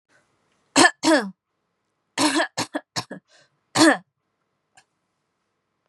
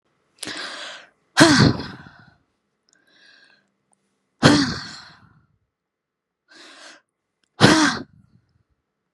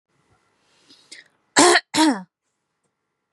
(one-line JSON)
{"three_cough_length": "5.9 s", "three_cough_amplitude": 27316, "three_cough_signal_mean_std_ratio": 0.31, "exhalation_length": "9.1 s", "exhalation_amplitude": 32767, "exhalation_signal_mean_std_ratio": 0.3, "cough_length": "3.3 s", "cough_amplitude": 32220, "cough_signal_mean_std_ratio": 0.3, "survey_phase": "beta (2021-08-13 to 2022-03-07)", "age": "18-44", "gender": "Female", "wearing_mask": "No", "symptom_fatigue": true, "smoker_status": "Never smoked", "respiratory_condition_asthma": false, "respiratory_condition_other": false, "recruitment_source": "REACT", "submission_delay": "1 day", "covid_test_result": "Negative", "covid_test_method": "RT-qPCR", "influenza_a_test_result": "Negative", "influenza_b_test_result": "Negative"}